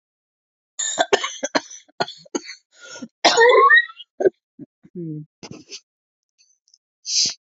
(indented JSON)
{
  "cough_length": "7.4 s",
  "cough_amplitude": 28162,
  "cough_signal_mean_std_ratio": 0.36,
  "survey_phase": "beta (2021-08-13 to 2022-03-07)",
  "age": "45-64",
  "gender": "Female",
  "wearing_mask": "No",
  "symptom_cough_any": true,
  "symptom_runny_or_blocked_nose": true,
  "symptom_shortness_of_breath": true,
  "symptom_sore_throat": true,
  "symptom_abdominal_pain": true,
  "symptom_diarrhoea": true,
  "symptom_fever_high_temperature": true,
  "symptom_onset": "3 days",
  "smoker_status": "Never smoked",
  "respiratory_condition_asthma": false,
  "respiratory_condition_other": false,
  "recruitment_source": "Test and Trace",
  "submission_delay": "1 day",
  "covid_test_result": "Positive",
  "covid_test_method": "RT-qPCR",
  "covid_ct_value": 15.0,
  "covid_ct_gene": "ORF1ab gene",
  "covid_ct_mean": 15.4,
  "covid_viral_load": "8900000 copies/ml",
  "covid_viral_load_category": "High viral load (>1M copies/ml)"
}